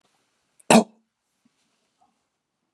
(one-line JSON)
{"cough_length": "2.7 s", "cough_amplitude": 30992, "cough_signal_mean_std_ratio": 0.17, "survey_phase": "beta (2021-08-13 to 2022-03-07)", "age": "65+", "gender": "Male", "wearing_mask": "No", "symptom_none": true, "smoker_status": "Ex-smoker", "respiratory_condition_asthma": false, "respiratory_condition_other": false, "recruitment_source": "REACT", "submission_delay": "1 day", "covid_test_result": "Negative", "covid_test_method": "RT-qPCR"}